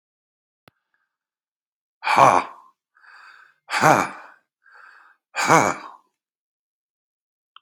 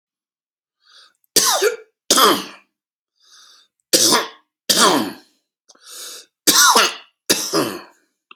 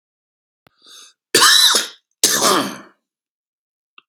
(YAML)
exhalation_length: 7.6 s
exhalation_amplitude: 32767
exhalation_signal_mean_std_ratio: 0.27
three_cough_length: 8.4 s
three_cough_amplitude: 32768
three_cough_signal_mean_std_ratio: 0.42
cough_length: 4.1 s
cough_amplitude: 32768
cough_signal_mean_std_ratio: 0.39
survey_phase: alpha (2021-03-01 to 2021-08-12)
age: 45-64
gender: Male
wearing_mask: 'No'
symptom_none: true
symptom_cough_any: true
smoker_status: Current smoker (1 to 10 cigarettes per day)
respiratory_condition_asthma: false
respiratory_condition_other: false
recruitment_source: REACT
submission_delay: 5 days
covid_test_result: Negative
covid_test_method: RT-qPCR